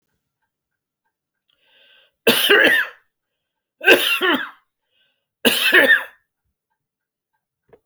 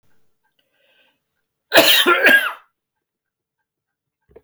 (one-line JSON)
{"three_cough_length": "7.9 s", "three_cough_amplitude": 30982, "three_cough_signal_mean_std_ratio": 0.37, "cough_length": "4.4 s", "cough_amplitude": 31806, "cough_signal_mean_std_ratio": 0.33, "survey_phase": "beta (2021-08-13 to 2022-03-07)", "age": "65+", "gender": "Male", "wearing_mask": "No", "symptom_none": true, "smoker_status": "Never smoked", "respiratory_condition_asthma": false, "respiratory_condition_other": false, "recruitment_source": "REACT", "submission_delay": "5 days", "covid_test_result": "Negative", "covid_test_method": "RT-qPCR"}